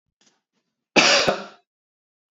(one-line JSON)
{"cough_length": "2.3 s", "cough_amplitude": 30207, "cough_signal_mean_std_ratio": 0.33, "survey_phase": "beta (2021-08-13 to 2022-03-07)", "age": "18-44", "gender": "Male", "wearing_mask": "No", "symptom_none": true, "smoker_status": "Never smoked", "respiratory_condition_asthma": false, "respiratory_condition_other": false, "recruitment_source": "REACT", "submission_delay": "2 days", "covid_test_result": "Negative", "covid_test_method": "RT-qPCR", "influenza_a_test_result": "Negative", "influenza_b_test_result": "Negative"}